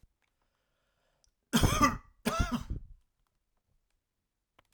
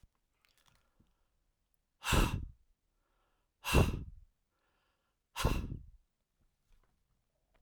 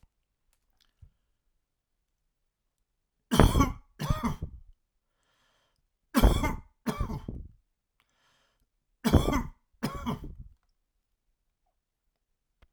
{"cough_length": "4.7 s", "cough_amplitude": 8518, "cough_signal_mean_std_ratio": 0.32, "exhalation_length": "7.6 s", "exhalation_amplitude": 6810, "exhalation_signal_mean_std_ratio": 0.28, "three_cough_length": "12.7 s", "three_cough_amplitude": 31607, "three_cough_signal_mean_std_ratio": 0.29, "survey_phase": "alpha (2021-03-01 to 2021-08-12)", "age": "65+", "gender": "Male", "wearing_mask": "No", "symptom_none": true, "smoker_status": "Never smoked", "respiratory_condition_asthma": false, "respiratory_condition_other": false, "recruitment_source": "REACT", "submission_delay": "2 days", "covid_test_result": "Negative", "covid_test_method": "RT-qPCR"}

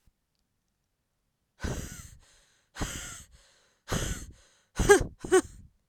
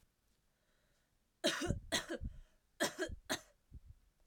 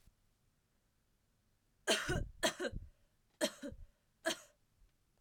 {"exhalation_length": "5.9 s", "exhalation_amplitude": 18137, "exhalation_signal_mean_std_ratio": 0.3, "three_cough_length": "4.3 s", "three_cough_amplitude": 3406, "three_cough_signal_mean_std_ratio": 0.41, "cough_length": "5.2 s", "cough_amplitude": 3970, "cough_signal_mean_std_ratio": 0.35, "survey_phase": "beta (2021-08-13 to 2022-03-07)", "age": "18-44", "gender": "Female", "wearing_mask": "No", "symptom_cough_any": true, "symptom_new_continuous_cough": true, "symptom_runny_or_blocked_nose": true, "symptom_shortness_of_breath": true, "symptom_sore_throat": true, "symptom_fever_high_temperature": true, "symptom_headache": true, "symptom_change_to_sense_of_smell_or_taste": true, "symptom_loss_of_taste": true, "symptom_onset": "6 days", "smoker_status": "Never smoked", "respiratory_condition_asthma": false, "respiratory_condition_other": false, "recruitment_source": "Test and Trace", "submission_delay": "2 days", "covid_test_result": "Positive", "covid_test_method": "RT-qPCR", "covid_ct_value": 26.7, "covid_ct_gene": "ORF1ab gene", "covid_ct_mean": 26.9, "covid_viral_load": "1600 copies/ml", "covid_viral_load_category": "Minimal viral load (< 10K copies/ml)"}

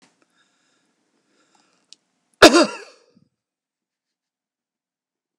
{"cough_length": "5.4 s", "cough_amplitude": 32768, "cough_signal_mean_std_ratio": 0.16, "survey_phase": "beta (2021-08-13 to 2022-03-07)", "age": "65+", "gender": "Male", "wearing_mask": "No", "symptom_none": true, "smoker_status": "Ex-smoker", "respiratory_condition_asthma": false, "respiratory_condition_other": false, "recruitment_source": "REACT", "submission_delay": "2 days", "covid_test_result": "Negative", "covid_test_method": "RT-qPCR", "influenza_a_test_result": "Negative", "influenza_b_test_result": "Negative"}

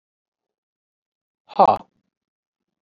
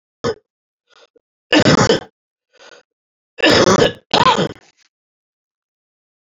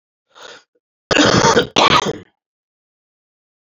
{"exhalation_length": "2.8 s", "exhalation_amplitude": 28152, "exhalation_signal_mean_std_ratio": 0.18, "three_cough_length": "6.2 s", "three_cough_amplitude": 32249, "three_cough_signal_mean_std_ratio": 0.37, "cough_length": "3.8 s", "cough_amplitude": 31541, "cough_signal_mean_std_ratio": 0.39, "survey_phase": "beta (2021-08-13 to 2022-03-07)", "age": "45-64", "gender": "Male", "wearing_mask": "No", "symptom_new_continuous_cough": true, "symptom_change_to_sense_of_smell_or_taste": true, "symptom_loss_of_taste": true, "symptom_onset": "3 days", "smoker_status": "Never smoked", "respiratory_condition_asthma": false, "respiratory_condition_other": false, "recruitment_source": "Test and Trace", "submission_delay": "1 day", "covid_test_result": "Positive", "covid_test_method": "RT-qPCR", "covid_ct_value": 19.4, "covid_ct_gene": "ORF1ab gene"}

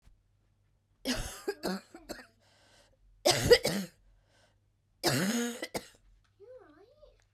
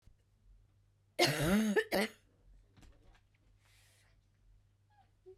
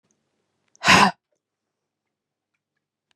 {"three_cough_length": "7.3 s", "three_cough_amplitude": 13464, "three_cough_signal_mean_std_ratio": 0.34, "cough_length": "5.4 s", "cough_amplitude": 5434, "cough_signal_mean_std_ratio": 0.34, "exhalation_length": "3.2 s", "exhalation_amplitude": 30596, "exhalation_signal_mean_std_ratio": 0.22, "survey_phase": "beta (2021-08-13 to 2022-03-07)", "age": "18-44", "gender": "Female", "wearing_mask": "No", "symptom_cough_any": true, "symptom_new_continuous_cough": true, "symptom_runny_or_blocked_nose": true, "symptom_shortness_of_breath": true, "symptom_sore_throat": true, "symptom_fatigue": true, "symptom_fever_high_temperature": true, "symptom_headache": true, "symptom_change_to_sense_of_smell_or_taste": true, "symptom_onset": "2 days", "smoker_status": "Never smoked", "respiratory_condition_asthma": true, "respiratory_condition_other": false, "recruitment_source": "Test and Trace", "submission_delay": "1 day", "covid_test_result": "Positive", "covid_test_method": "RT-qPCR", "covid_ct_value": 27.0, "covid_ct_gene": "ORF1ab gene"}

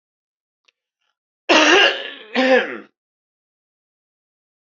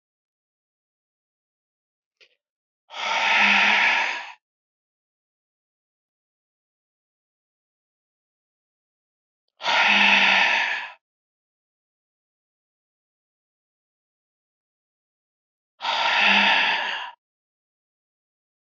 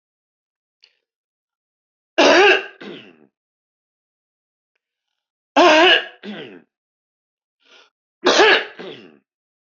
{"cough_length": "4.8 s", "cough_amplitude": 28379, "cough_signal_mean_std_ratio": 0.34, "exhalation_length": "18.6 s", "exhalation_amplitude": 19679, "exhalation_signal_mean_std_ratio": 0.35, "three_cough_length": "9.6 s", "three_cough_amplitude": 32023, "three_cough_signal_mean_std_ratio": 0.31, "survey_phase": "beta (2021-08-13 to 2022-03-07)", "age": "65+", "gender": "Male", "wearing_mask": "No", "symptom_cough_any": true, "symptom_sore_throat": true, "symptom_onset": "12 days", "smoker_status": "Never smoked", "respiratory_condition_asthma": false, "respiratory_condition_other": false, "recruitment_source": "REACT", "submission_delay": "1 day", "covid_test_result": "Negative", "covid_test_method": "RT-qPCR"}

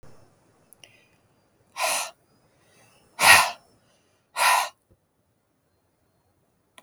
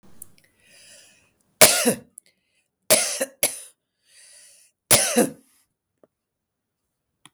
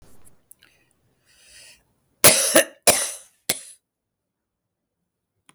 {"exhalation_length": "6.8 s", "exhalation_amplitude": 31664, "exhalation_signal_mean_std_ratio": 0.26, "three_cough_length": "7.3 s", "three_cough_amplitude": 32766, "three_cough_signal_mean_std_ratio": 0.28, "cough_length": "5.5 s", "cough_amplitude": 32768, "cough_signal_mean_std_ratio": 0.25, "survey_phase": "beta (2021-08-13 to 2022-03-07)", "age": "65+", "gender": "Female", "wearing_mask": "No", "symptom_none": true, "smoker_status": "Ex-smoker", "respiratory_condition_asthma": false, "respiratory_condition_other": false, "recruitment_source": "REACT", "submission_delay": "2 days", "covid_test_result": "Negative", "covid_test_method": "RT-qPCR", "influenza_a_test_result": "Negative", "influenza_b_test_result": "Negative"}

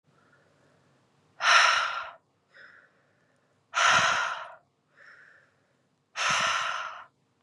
{"exhalation_length": "7.4 s", "exhalation_amplitude": 14988, "exhalation_signal_mean_std_ratio": 0.41, "survey_phase": "beta (2021-08-13 to 2022-03-07)", "age": "18-44", "gender": "Female", "wearing_mask": "No", "symptom_cough_any": true, "symptom_runny_or_blocked_nose": true, "symptom_sore_throat": true, "symptom_fatigue": true, "symptom_headache": true, "symptom_other": true, "symptom_onset": "4 days", "smoker_status": "Prefer not to say", "respiratory_condition_asthma": false, "respiratory_condition_other": false, "recruitment_source": "Test and Trace", "submission_delay": "2 days", "covid_test_result": "Positive", "covid_test_method": "RT-qPCR"}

